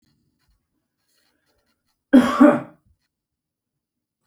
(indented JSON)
{
  "cough_length": "4.3 s",
  "cough_amplitude": 29006,
  "cough_signal_mean_std_ratio": 0.23,
  "survey_phase": "beta (2021-08-13 to 2022-03-07)",
  "age": "45-64",
  "gender": "Male",
  "wearing_mask": "No",
  "symptom_none": true,
  "smoker_status": "Ex-smoker",
  "respiratory_condition_asthma": false,
  "respiratory_condition_other": false,
  "recruitment_source": "REACT",
  "submission_delay": "3 days",
  "covid_test_result": "Negative",
  "covid_test_method": "RT-qPCR"
}